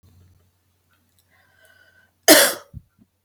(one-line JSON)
{"cough_length": "3.2 s", "cough_amplitude": 32768, "cough_signal_mean_std_ratio": 0.22, "survey_phase": "alpha (2021-03-01 to 2021-08-12)", "age": "45-64", "gender": "Female", "wearing_mask": "No", "symptom_none": true, "smoker_status": "Never smoked", "respiratory_condition_asthma": true, "respiratory_condition_other": false, "recruitment_source": "REACT", "submission_delay": "3 days", "covid_test_result": "Negative", "covid_test_method": "RT-qPCR"}